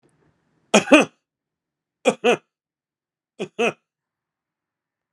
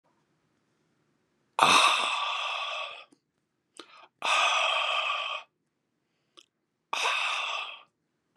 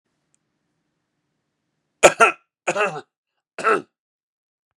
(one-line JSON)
{"three_cough_length": "5.1 s", "three_cough_amplitude": 32767, "three_cough_signal_mean_std_ratio": 0.23, "exhalation_length": "8.4 s", "exhalation_amplitude": 23156, "exhalation_signal_mean_std_ratio": 0.48, "cough_length": "4.8 s", "cough_amplitude": 32768, "cough_signal_mean_std_ratio": 0.24, "survey_phase": "beta (2021-08-13 to 2022-03-07)", "age": "65+", "gender": "Male", "wearing_mask": "No", "symptom_other": true, "smoker_status": "Never smoked", "respiratory_condition_asthma": false, "respiratory_condition_other": false, "recruitment_source": "REACT", "submission_delay": "1 day", "covid_test_result": "Positive", "covid_test_method": "RT-qPCR", "covid_ct_value": 20.7, "covid_ct_gene": "E gene", "influenza_a_test_result": "Negative", "influenza_b_test_result": "Negative"}